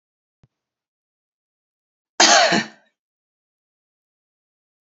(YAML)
cough_length: 4.9 s
cough_amplitude: 29481
cough_signal_mean_std_ratio: 0.23
survey_phase: beta (2021-08-13 to 2022-03-07)
age: 45-64
gender: Female
wearing_mask: 'No'
symptom_none: true
smoker_status: Ex-smoker
respiratory_condition_asthma: false
respiratory_condition_other: false
recruitment_source: Test and Trace
submission_delay: 3 days
covid_test_result: Negative
covid_test_method: LFT